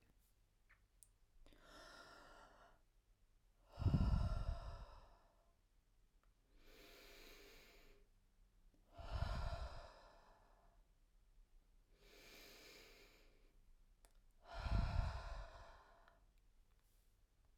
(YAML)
exhalation_length: 17.6 s
exhalation_amplitude: 1640
exhalation_signal_mean_std_ratio: 0.37
survey_phase: beta (2021-08-13 to 2022-03-07)
age: 18-44
gender: Female
wearing_mask: 'No'
symptom_cough_any: true
symptom_runny_or_blocked_nose: true
symptom_sore_throat: true
symptom_fatigue: true
symptom_change_to_sense_of_smell_or_taste: true
symptom_loss_of_taste: true
symptom_onset: 5 days
smoker_status: Never smoked
respiratory_condition_asthma: false
respiratory_condition_other: false
recruitment_source: Test and Trace
submission_delay: 2 days
covid_test_result: Positive
covid_test_method: RT-qPCR
covid_ct_value: 16.0
covid_ct_gene: ORF1ab gene